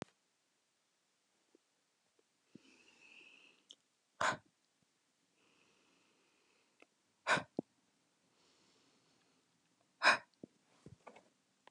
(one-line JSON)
{"exhalation_length": "11.7 s", "exhalation_amplitude": 5649, "exhalation_signal_mean_std_ratio": 0.17, "survey_phase": "alpha (2021-03-01 to 2021-08-12)", "age": "18-44", "gender": "Female", "wearing_mask": "No", "symptom_none": true, "smoker_status": "Never smoked", "respiratory_condition_asthma": false, "respiratory_condition_other": false, "recruitment_source": "REACT", "submission_delay": "1 day", "covid_test_result": "Negative", "covid_test_method": "RT-qPCR"}